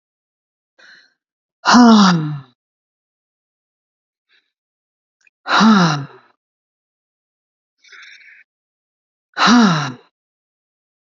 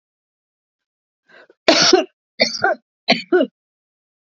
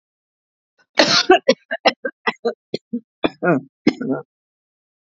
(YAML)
exhalation_length: 11.0 s
exhalation_amplitude: 32768
exhalation_signal_mean_std_ratio: 0.32
three_cough_length: 4.3 s
three_cough_amplitude: 32768
three_cough_signal_mean_std_ratio: 0.35
cough_length: 5.1 s
cough_amplitude: 32768
cough_signal_mean_std_ratio: 0.35
survey_phase: beta (2021-08-13 to 2022-03-07)
age: 65+
gender: Female
wearing_mask: 'No'
symptom_cough_any: true
smoker_status: Never smoked
respiratory_condition_asthma: true
respiratory_condition_other: false
recruitment_source: REACT
submission_delay: 6 days
covid_test_result: Negative
covid_test_method: RT-qPCR